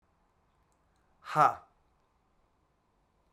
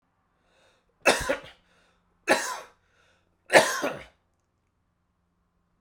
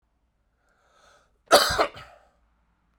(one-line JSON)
{"exhalation_length": "3.3 s", "exhalation_amplitude": 9236, "exhalation_signal_mean_std_ratio": 0.19, "three_cough_length": "5.8 s", "three_cough_amplitude": 29907, "three_cough_signal_mean_std_ratio": 0.27, "cough_length": "3.0 s", "cough_amplitude": 31771, "cough_signal_mean_std_ratio": 0.25, "survey_phase": "beta (2021-08-13 to 2022-03-07)", "age": "45-64", "gender": "Male", "wearing_mask": "No", "symptom_cough_any": true, "symptom_new_continuous_cough": true, "symptom_shortness_of_breath": true, "symptom_sore_throat": true, "symptom_fatigue": true, "symptom_onset": "6 days", "smoker_status": "Never smoked", "respiratory_condition_asthma": false, "respiratory_condition_other": false, "recruitment_source": "Test and Trace", "submission_delay": "2 days", "covid_test_result": "Positive", "covid_test_method": "ePCR"}